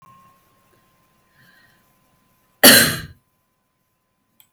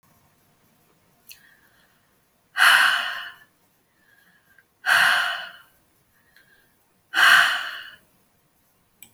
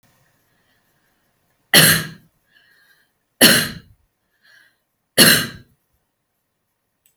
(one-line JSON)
{"cough_length": "4.5 s", "cough_amplitude": 32768, "cough_signal_mean_std_ratio": 0.21, "exhalation_length": "9.1 s", "exhalation_amplitude": 25091, "exhalation_signal_mean_std_ratio": 0.34, "three_cough_length": "7.2 s", "three_cough_amplitude": 32768, "three_cough_signal_mean_std_ratio": 0.27, "survey_phase": "alpha (2021-03-01 to 2021-08-12)", "age": "45-64", "gender": "Female", "wearing_mask": "No", "symptom_none": true, "smoker_status": "Never smoked", "respiratory_condition_asthma": true, "respiratory_condition_other": false, "recruitment_source": "REACT", "submission_delay": "2 days", "covid_test_result": "Negative", "covid_test_method": "RT-qPCR"}